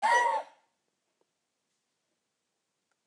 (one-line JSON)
{"cough_length": "3.1 s", "cough_amplitude": 6434, "cough_signal_mean_std_ratio": 0.3, "survey_phase": "beta (2021-08-13 to 2022-03-07)", "age": "65+", "gender": "Female", "wearing_mask": "No", "symptom_none": true, "smoker_status": "Ex-smoker", "respiratory_condition_asthma": false, "respiratory_condition_other": false, "recruitment_source": "REACT", "submission_delay": "3 days", "covid_test_result": "Negative", "covid_test_method": "RT-qPCR", "influenza_a_test_result": "Negative", "influenza_b_test_result": "Negative"}